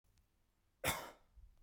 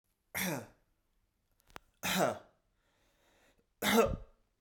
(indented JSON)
{
  "cough_length": "1.6 s",
  "cough_amplitude": 2353,
  "cough_signal_mean_std_ratio": 0.32,
  "three_cough_length": "4.6 s",
  "three_cough_amplitude": 5622,
  "three_cough_signal_mean_std_ratio": 0.35,
  "survey_phase": "beta (2021-08-13 to 2022-03-07)",
  "age": "18-44",
  "gender": "Male",
  "wearing_mask": "No",
  "symptom_none": true,
  "smoker_status": "Never smoked",
  "respiratory_condition_asthma": false,
  "respiratory_condition_other": false,
  "recruitment_source": "REACT",
  "submission_delay": "2 days",
  "covid_test_result": "Negative",
  "covid_test_method": "RT-qPCR",
  "covid_ct_value": 38.0,
  "covid_ct_gene": "N gene",
  "influenza_a_test_result": "Positive",
  "influenza_a_ct_value": 33.0,
  "influenza_b_test_result": "Positive",
  "influenza_b_ct_value": 34.2
}